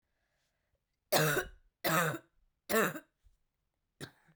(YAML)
three_cough_length: 4.4 s
three_cough_amplitude: 6047
three_cough_signal_mean_std_ratio: 0.37
survey_phase: beta (2021-08-13 to 2022-03-07)
age: 18-44
gender: Female
wearing_mask: 'No'
symptom_cough_any: true
symptom_runny_or_blocked_nose: true
symptom_shortness_of_breath: true
symptom_sore_throat: true
symptom_diarrhoea: true
symptom_fatigue: true
symptom_fever_high_temperature: true
symptom_headache: true
symptom_change_to_sense_of_smell_or_taste: true
symptom_loss_of_taste: true
symptom_other: true
symptom_onset: 2 days
smoker_status: Never smoked
respiratory_condition_asthma: true
respiratory_condition_other: false
recruitment_source: Test and Trace
submission_delay: 2 days
covid_test_result: Positive
covid_test_method: RT-qPCR
covid_ct_value: 24.7
covid_ct_gene: S gene
covid_ct_mean: 25.2
covid_viral_load: 5500 copies/ml
covid_viral_load_category: Minimal viral load (< 10K copies/ml)